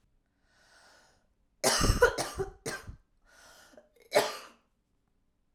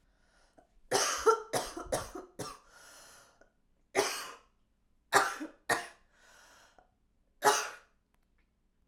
{"cough_length": "5.5 s", "cough_amplitude": 10517, "cough_signal_mean_std_ratio": 0.32, "three_cough_length": "8.9 s", "three_cough_amplitude": 13234, "three_cough_signal_mean_std_ratio": 0.35, "survey_phase": "beta (2021-08-13 to 2022-03-07)", "age": "18-44", "gender": "Female", "wearing_mask": "No", "symptom_new_continuous_cough": true, "symptom_runny_or_blocked_nose": true, "symptom_fatigue": true, "symptom_change_to_sense_of_smell_or_taste": true, "symptom_loss_of_taste": true, "symptom_onset": "6 days", "smoker_status": "Never smoked", "respiratory_condition_asthma": true, "respiratory_condition_other": false, "recruitment_source": "Test and Trace", "submission_delay": "1 day", "covid_test_result": "Positive", "covid_test_method": "RT-qPCR", "covid_ct_value": 13.3, "covid_ct_gene": "ORF1ab gene", "covid_ct_mean": 13.8, "covid_viral_load": "31000000 copies/ml", "covid_viral_load_category": "High viral load (>1M copies/ml)"}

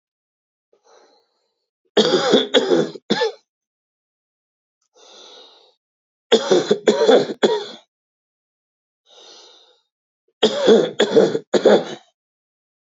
{"three_cough_length": "13.0 s", "three_cough_amplitude": 27055, "three_cough_signal_mean_std_ratio": 0.38, "survey_phase": "beta (2021-08-13 to 2022-03-07)", "age": "45-64", "gender": "Male", "wearing_mask": "No", "symptom_none": true, "smoker_status": "Current smoker (1 to 10 cigarettes per day)", "respiratory_condition_asthma": true, "respiratory_condition_other": false, "recruitment_source": "Test and Trace", "submission_delay": "0 days", "covid_test_result": "Negative", "covid_test_method": "LFT"}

